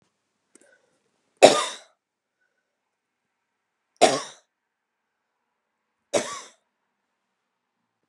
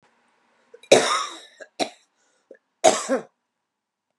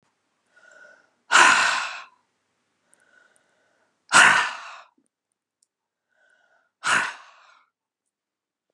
{"three_cough_length": "8.1 s", "three_cough_amplitude": 32767, "three_cough_signal_mean_std_ratio": 0.17, "cough_length": "4.2 s", "cough_amplitude": 32738, "cough_signal_mean_std_ratio": 0.29, "exhalation_length": "8.7 s", "exhalation_amplitude": 30120, "exhalation_signal_mean_std_ratio": 0.28, "survey_phase": "beta (2021-08-13 to 2022-03-07)", "age": "45-64", "gender": "Female", "wearing_mask": "No", "symptom_cough_any": true, "symptom_runny_or_blocked_nose": true, "symptom_sore_throat": true, "symptom_headache": true, "symptom_other": true, "smoker_status": "Never smoked", "respiratory_condition_asthma": true, "respiratory_condition_other": false, "recruitment_source": "Test and Trace", "submission_delay": "1 day", "covid_test_result": "Positive", "covid_test_method": "RT-qPCR", "covid_ct_value": 24.2, "covid_ct_gene": "ORF1ab gene", "covid_ct_mean": 24.7, "covid_viral_load": "7900 copies/ml", "covid_viral_load_category": "Minimal viral load (< 10K copies/ml)"}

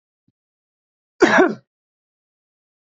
{"cough_length": "3.0 s", "cough_amplitude": 30311, "cough_signal_mean_std_ratio": 0.25, "survey_phase": "beta (2021-08-13 to 2022-03-07)", "age": "45-64", "gender": "Male", "wearing_mask": "No", "symptom_none": true, "smoker_status": "Ex-smoker", "respiratory_condition_asthma": false, "respiratory_condition_other": false, "recruitment_source": "REACT", "submission_delay": "0 days", "covid_test_method": "RT-qPCR"}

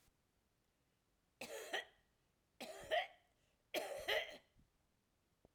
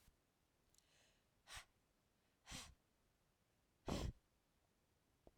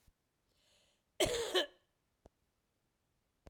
{"three_cough_length": "5.5 s", "three_cough_amplitude": 1395, "three_cough_signal_mean_std_ratio": 0.36, "exhalation_length": "5.4 s", "exhalation_amplitude": 814, "exhalation_signal_mean_std_ratio": 0.28, "cough_length": "3.5 s", "cough_amplitude": 4063, "cough_signal_mean_std_ratio": 0.28, "survey_phase": "beta (2021-08-13 to 2022-03-07)", "age": "45-64", "gender": "Female", "wearing_mask": "No", "symptom_cough_any": true, "symptom_runny_or_blocked_nose": true, "symptom_abdominal_pain": true, "symptom_diarrhoea": true, "symptom_fatigue": true, "symptom_fever_high_temperature": true, "symptom_headache": true, "symptom_change_to_sense_of_smell_or_taste": true, "symptom_loss_of_taste": true, "symptom_onset": "6 days", "smoker_status": "Never smoked", "respiratory_condition_asthma": false, "respiratory_condition_other": false, "recruitment_source": "Test and Trace", "submission_delay": "3 days", "covid_test_result": "Positive", "covid_test_method": "RT-qPCR", "covid_ct_value": 16.1, "covid_ct_gene": "ORF1ab gene", "covid_ct_mean": 16.6, "covid_viral_load": "3500000 copies/ml", "covid_viral_load_category": "High viral load (>1M copies/ml)"}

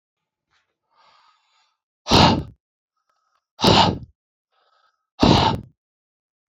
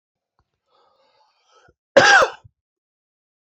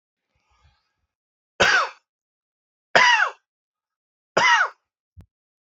{"exhalation_length": "6.5 s", "exhalation_amplitude": 28734, "exhalation_signal_mean_std_ratio": 0.31, "cough_length": "3.4 s", "cough_amplitude": 28039, "cough_signal_mean_std_ratio": 0.25, "three_cough_length": "5.7 s", "three_cough_amplitude": 26577, "three_cough_signal_mean_std_ratio": 0.33, "survey_phase": "beta (2021-08-13 to 2022-03-07)", "age": "45-64", "gender": "Male", "wearing_mask": "No", "symptom_cough_any": true, "symptom_new_continuous_cough": true, "symptom_runny_or_blocked_nose": true, "symptom_abdominal_pain": true, "symptom_fatigue": true, "symptom_onset": "3 days", "smoker_status": "Never smoked", "respiratory_condition_asthma": true, "respiratory_condition_other": false, "recruitment_source": "Test and Trace", "submission_delay": "1 day", "covid_test_result": "Positive", "covid_test_method": "RT-qPCR", "covid_ct_value": 25.7, "covid_ct_gene": "ORF1ab gene"}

